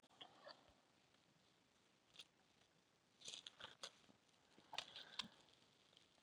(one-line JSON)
{"three_cough_length": "6.2 s", "three_cough_amplitude": 1380, "three_cough_signal_mean_std_ratio": 0.38, "survey_phase": "beta (2021-08-13 to 2022-03-07)", "age": "45-64", "gender": "Female", "wearing_mask": "No", "symptom_cough_any": true, "symptom_runny_or_blocked_nose": true, "symptom_shortness_of_breath": true, "symptom_sore_throat": true, "symptom_fatigue": true, "symptom_fever_high_temperature": true, "symptom_headache": true, "symptom_change_to_sense_of_smell_or_taste": true, "symptom_onset": "5 days", "smoker_status": "Ex-smoker", "respiratory_condition_asthma": false, "respiratory_condition_other": false, "recruitment_source": "Test and Trace", "submission_delay": "2 days", "covid_test_result": "Positive", "covid_test_method": "RT-qPCR", "covid_ct_value": 21.7, "covid_ct_gene": "N gene", "covid_ct_mean": 22.2, "covid_viral_load": "51000 copies/ml", "covid_viral_load_category": "Low viral load (10K-1M copies/ml)"}